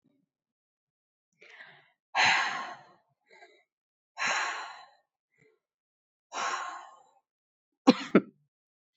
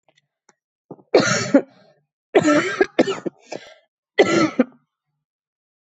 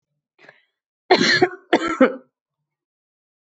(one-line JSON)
{"exhalation_length": "9.0 s", "exhalation_amplitude": 15152, "exhalation_signal_mean_std_ratio": 0.28, "three_cough_length": "5.8 s", "three_cough_amplitude": 25640, "three_cough_signal_mean_std_ratio": 0.38, "cough_length": "3.5 s", "cough_amplitude": 25590, "cough_signal_mean_std_ratio": 0.34, "survey_phase": "beta (2021-08-13 to 2022-03-07)", "age": "18-44", "gender": "Female", "wearing_mask": "No", "symptom_cough_any": true, "symptom_runny_or_blocked_nose": true, "symptom_fatigue": true, "symptom_headache": true, "symptom_change_to_sense_of_smell_or_taste": true, "symptom_onset": "5 days", "smoker_status": "Never smoked", "respiratory_condition_asthma": false, "respiratory_condition_other": false, "recruitment_source": "Test and Trace", "submission_delay": "1 day", "covid_test_result": "Positive", "covid_test_method": "RT-qPCR"}